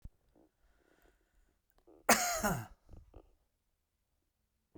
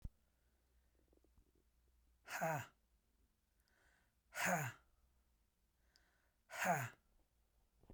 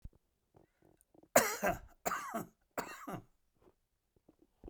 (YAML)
cough_length: 4.8 s
cough_amplitude: 10111
cough_signal_mean_std_ratio: 0.25
exhalation_length: 7.9 s
exhalation_amplitude: 1558
exhalation_signal_mean_std_ratio: 0.31
three_cough_length: 4.7 s
three_cough_amplitude: 9300
three_cough_signal_mean_std_ratio: 0.3
survey_phase: beta (2021-08-13 to 2022-03-07)
age: 45-64
gender: Male
wearing_mask: 'No'
symptom_runny_or_blocked_nose: true
symptom_headache: true
smoker_status: Ex-smoker
respiratory_condition_asthma: false
respiratory_condition_other: false
recruitment_source: Test and Trace
submission_delay: 1 day
covid_test_result: Positive
covid_test_method: ePCR